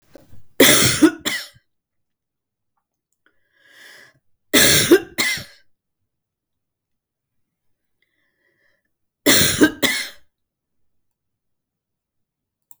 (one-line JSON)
{"three_cough_length": "12.8 s", "three_cough_amplitude": 32768, "three_cough_signal_mean_std_ratio": 0.3, "survey_phase": "beta (2021-08-13 to 2022-03-07)", "age": "65+", "gender": "Female", "wearing_mask": "No", "symptom_none": true, "smoker_status": "Ex-smoker", "respiratory_condition_asthma": false, "respiratory_condition_other": false, "recruitment_source": "REACT", "submission_delay": "1 day", "covid_test_result": "Negative", "covid_test_method": "RT-qPCR", "influenza_a_test_result": "Negative", "influenza_b_test_result": "Negative"}